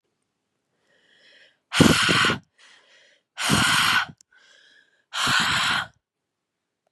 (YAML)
exhalation_length: 6.9 s
exhalation_amplitude: 30664
exhalation_signal_mean_std_ratio: 0.44
survey_phase: beta (2021-08-13 to 2022-03-07)
age: 18-44
gender: Female
wearing_mask: 'No'
symptom_cough_any: true
symptom_runny_or_blocked_nose: true
smoker_status: Never smoked
respiratory_condition_asthma: false
respiratory_condition_other: false
recruitment_source: REACT
submission_delay: 1 day
covid_test_result: Negative
covid_test_method: RT-qPCR
influenza_a_test_result: Negative
influenza_b_test_result: Negative